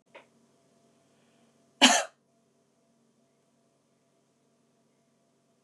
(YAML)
cough_length: 5.6 s
cough_amplitude: 22578
cough_signal_mean_std_ratio: 0.16
survey_phase: beta (2021-08-13 to 2022-03-07)
age: 45-64
gender: Female
wearing_mask: 'No'
symptom_none: true
smoker_status: Never smoked
respiratory_condition_asthma: false
respiratory_condition_other: false
recruitment_source: REACT
submission_delay: 1 day
covid_test_result: Negative
covid_test_method: RT-qPCR
influenza_a_test_result: Negative
influenza_b_test_result: Negative